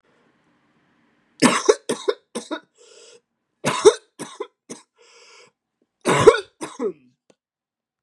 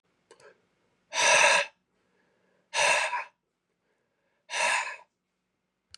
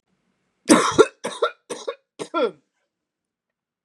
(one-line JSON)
{"three_cough_length": "8.0 s", "three_cough_amplitude": 32768, "three_cough_signal_mean_std_ratio": 0.27, "exhalation_length": "6.0 s", "exhalation_amplitude": 14437, "exhalation_signal_mean_std_ratio": 0.38, "cough_length": "3.8 s", "cough_amplitude": 32768, "cough_signal_mean_std_ratio": 0.3, "survey_phase": "beta (2021-08-13 to 2022-03-07)", "age": "18-44", "gender": "Male", "wearing_mask": "No", "symptom_none": true, "smoker_status": "Never smoked", "respiratory_condition_asthma": false, "respiratory_condition_other": false, "recruitment_source": "REACT", "submission_delay": "2 days", "covid_test_result": "Negative", "covid_test_method": "RT-qPCR", "influenza_a_test_result": "Negative", "influenza_b_test_result": "Negative"}